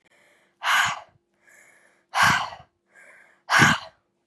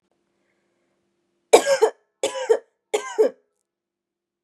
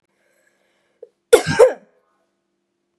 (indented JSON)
{
  "exhalation_length": "4.3 s",
  "exhalation_amplitude": 26758,
  "exhalation_signal_mean_std_ratio": 0.38,
  "three_cough_length": "4.4 s",
  "three_cough_amplitude": 32767,
  "three_cough_signal_mean_std_ratio": 0.3,
  "cough_length": "3.0 s",
  "cough_amplitude": 32768,
  "cough_signal_mean_std_ratio": 0.23,
  "survey_phase": "beta (2021-08-13 to 2022-03-07)",
  "age": "18-44",
  "gender": "Female",
  "wearing_mask": "No",
  "symptom_runny_or_blocked_nose": true,
  "symptom_abdominal_pain": true,
  "symptom_fatigue": true,
  "symptom_headache": true,
  "symptom_change_to_sense_of_smell_or_taste": true,
  "symptom_loss_of_taste": true,
  "symptom_other": true,
  "symptom_onset": "3 days",
  "smoker_status": "Never smoked",
  "respiratory_condition_asthma": false,
  "respiratory_condition_other": false,
  "recruitment_source": "Test and Trace",
  "submission_delay": "2 days",
  "covid_test_result": "Positive",
  "covid_test_method": "RT-qPCR"
}